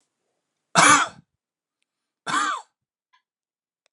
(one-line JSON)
{"cough_length": "3.9 s", "cough_amplitude": 30469, "cough_signal_mean_std_ratio": 0.29, "survey_phase": "beta (2021-08-13 to 2022-03-07)", "age": "45-64", "gender": "Male", "wearing_mask": "No", "symptom_none": true, "smoker_status": "Never smoked", "respiratory_condition_asthma": false, "respiratory_condition_other": false, "recruitment_source": "REACT", "submission_delay": "3 days", "covid_test_result": "Negative", "covid_test_method": "RT-qPCR"}